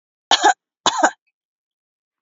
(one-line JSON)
{"cough_length": "2.2 s", "cough_amplitude": 32535, "cough_signal_mean_std_ratio": 0.32, "survey_phase": "beta (2021-08-13 to 2022-03-07)", "age": "45-64", "gender": "Female", "wearing_mask": "No", "symptom_none": true, "smoker_status": "Never smoked", "respiratory_condition_asthma": false, "respiratory_condition_other": false, "recruitment_source": "REACT", "submission_delay": "0 days", "covid_test_result": "Negative", "covid_test_method": "RT-qPCR", "influenza_a_test_result": "Negative", "influenza_b_test_result": "Negative"}